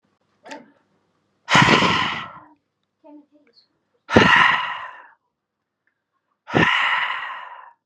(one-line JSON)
{"exhalation_length": "7.9 s", "exhalation_amplitude": 32768, "exhalation_signal_mean_std_ratio": 0.41, "survey_phase": "beta (2021-08-13 to 2022-03-07)", "age": "18-44", "gender": "Male", "wearing_mask": "No", "symptom_none": true, "smoker_status": "Ex-smoker", "respiratory_condition_asthma": true, "respiratory_condition_other": false, "recruitment_source": "REACT", "submission_delay": "1 day", "covid_test_result": "Negative", "covid_test_method": "RT-qPCR", "influenza_a_test_result": "Negative", "influenza_b_test_result": "Negative"}